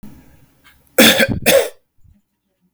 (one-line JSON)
{"cough_length": "2.7 s", "cough_amplitude": 32768, "cough_signal_mean_std_ratio": 0.39, "survey_phase": "beta (2021-08-13 to 2022-03-07)", "age": "18-44", "gender": "Male", "wearing_mask": "No", "symptom_none": true, "smoker_status": "Never smoked", "respiratory_condition_asthma": false, "respiratory_condition_other": false, "recruitment_source": "REACT", "submission_delay": "1 day", "covid_test_result": "Negative", "covid_test_method": "RT-qPCR", "influenza_a_test_result": "Negative", "influenza_b_test_result": "Negative"}